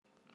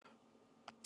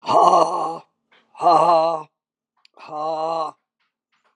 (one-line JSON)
{"three_cough_length": "0.3 s", "three_cough_amplitude": 225, "three_cough_signal_mean_std_ratio": 0.85, "cough_length": "0.9 s", "cough_amplitude": 796, "cough_signal_mean_std_ratio": 0.59, "exhalation_length": "4.4 s", "exhalation_amplitude": 28899, "exhalation_signal_mean_std_ratio": 0.5, "survey_phase": "alpha (2021-03-01 to 2021-08-12)", "age": "45-64", "gender": "Male", "wearing_mask": "No", "symptom_fatigue": true, "symptom_headache": true, "symptom_change_to_sense_of_smell_or_taste": true, "smoker_status": "Never smoked", "respiratory_condition_asthma": false, "respiratory_condition_other": false, "recruitment_source": "Test and Trace", "submission_delay": "2 days", "covid_test_result": "Positive", "covid_test_method": "RT-qPCR", "covid_ct_value": 15.3, "covid_ct_gene": "ORF1ab gene", "covid_ct_mean": 15.6, "covid_viral_load": "7500000 copies/ml", "covid_viral_load_category": "High viral load (>1M copies/ml)"}